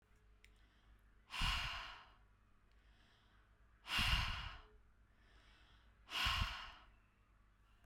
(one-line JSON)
{"exhalation_length": "7.9 s", "exhalation_amplitude": 1990, "exhalation_signal_mean_std_ratio": 0.42, "survey_phase": "beta (2021-08-13 to 2022-03-07)", "age": "18-44", "gender": "Female", "wearing_mask": "No", "symptom_fatigue": true, "symptom_headache": true, "smoker_status": "Ex-smoker", "respiratory_condition_asthma": false, "respiratory_condition_other": false, "recruitment_source": "REACT", "submission_delay": "7 days", "covid_test_result": "Negative", "covid_test_method": "RT-qPCR"}